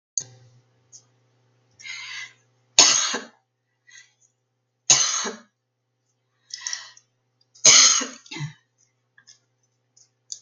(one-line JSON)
{"three_cough_length": "10.4 s", "three_cough_amplitude": 32768, "three_cough_signal_mean_std_ratio": 0.27, "survey_phase": "beta (2021-08-13 to 2022-03-07)", "age": "65+", "gender": "Female", "wearing_mask": "No", "symptom_none": true, "smoker_status": "Ex-smoker", "respiratory_condition_asthma": false, "respiratory_condition_other": false, "recruitment_source": "REACT", "submission_delay": "2 days", "covid_test_result": "Negative", "covid_test_method": "RT-qPCR", "influenza_a_test_result": "Negative", "influenza_b_test_result": "Positive", "influenza_b_ct_value": 35.7}